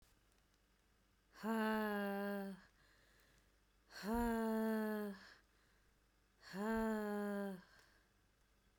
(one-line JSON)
{"exhalation_length": "8.8 s", "exhalation_amplitude": 1267, "exhalation_signal_mean_std_ratio": 0.59, "survey_phase": "beta (2021-08-13 to 2022-03-07)", "age": "45-64", "gender": "Female", "wearing_mask": "No", "symptom_none": true, "symptom_onset": "6 days", "smoker_status": "Ex-smoker", "respiratory_condition_asthma": false, "respiratory_condition_other": false, "recruitment_source": "REACT", "submission_delay": "2 days", "covid_test_result": "Negative", "covid_test_method": "RT-qPCR"}